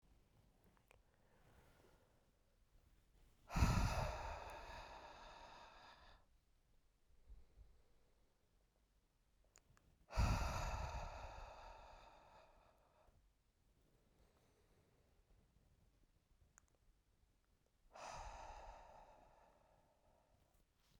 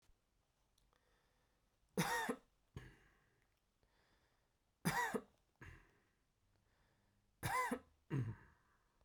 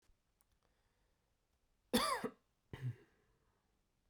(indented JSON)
{
  "exhalation_length": "21.0 s",
  "exhalation_amplitude": 2351,
  "exhalation_signal_mean_std_ratio": 0.32,
  "three_cough_length": "9.0 s",
  "three_cough_amplitude": 1825,
  "three_cough_signal_mean_std_ratio": 0.34,
  "cough_length": "4.1 s",
  "cough_amplitude": 3109,
  "cough_signal_mean_std_ratio": 0.27,
  "survey_phase": "beta (2021-08-13 to 2022-03-07)",
  "age": "18-44",
  "gender": "Male",
  "wearing_mask": "No",
  "symptom_cough_any": true,
  "symptom_new_continuous_cough": true,
  "symptom_runny_or_blocked_nose": true,
  "symptom_sore_throat": true,
  "symptom_fatigue": true,
  "symptom_onset": "3 days",
  "smoker_status": "Never smoked",
  "respiratory_condition_asthma": false,
  "respiratory_condition_other": false,
  "recruitment_source": "Test and Trace",
  "submission_delay": "2 days",
  "covid_test_result": "Positive",
  "covid_test_method": "RT-qPCR",
  "covid_ct_value": 21.6,
  "covid_ct_gene": "ORF1ab gene",
  "covid_ct_mean": 22.5,
  "covid_viral_load": "42000 copies/ml",
  "covid_viral_load_category": "Low viral load (10K-1M copies/ml)"
}